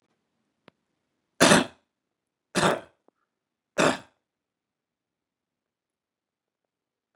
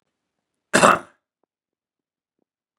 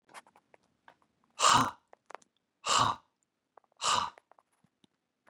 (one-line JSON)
{"three_cough_length": "7.2 s", "three_cough_amplitude": 29047, "three_cough_signal_mean_std_ratio": 0.21, "cough_length": "2.8 s", "cough_amplitude": 32768, "cough_signal_mean_std_ratio": 0.21, "exhalation_length": "5.3 s", "exhalation_amplitude": 8955, "exhalation_signal_mean_std_ratio": 0.3, "survey_phase": "beta (2021-08-13 to 2022-03-07)", "age": "45-64", "gender": "Male", "wearing_mask": "No", "symptom_none": true, "smoker_status": "Never smoked", "respiratory_condition_asthma": false, "respiratory_condition_other": false, "recruitment_source": "REACT", "submission_delay": "3 days", "covid_test_result": "Negative", "covid_test_method": "RT-qPCR", "influenza_a_test_result": "Negative", "influenza_b_test_result": "Negative"}